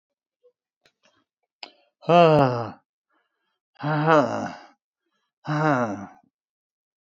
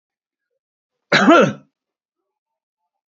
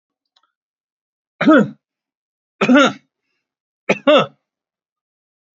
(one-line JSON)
{"exhalation_length": "7.2 s", "exhalation_amplitude": 22967, "exhalation_signal_mean_std_ratio": 0.34, "cough_length": "3.2 s", "cough_amplitude": 28253, "cough_signal_mean_std_ratio": 0.29, "three_cough_length": "5.5 s", "three_cough_amplitude": 28852, "three_cough_signal_mean_std_ratio": 0.31, "survey_phase": "beta (2021-08-13 to 2022-03-07)", "age": "65+", "gender": "Male", "wearing_mask": "No", "symptom_none": true, "smoker_status": "Ex-smoker", "respiratory_condition_asthma": false, "respiratory_condition_other": false, "recruitment_source": "REACT", "submission_delay": "1 day", "covid_test_result": "Negative", "covid_test_method": "RT-qPCR"}